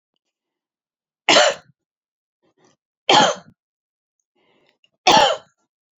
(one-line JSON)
{"three_cough_length": "6.0 s", "three_cough_amplitude": 32767, "three_cough_signal_mean_std_ratio": 0.29, "survey_phase": "alpha (2021-03-01 to 2021-08-12)", "age": "65+", "gender": "Female", "wearing_mask": "No", "symptom_none": true, "smoker_status": "Never smoked", "respiratory_condition_asthma": false, "respiratory_condition_other": false, "recruitment_source": "Test and Trace", "submission_delay": "2 days", "covid_test_result": "Negative", "covid_test_method": "RT-qPCR"}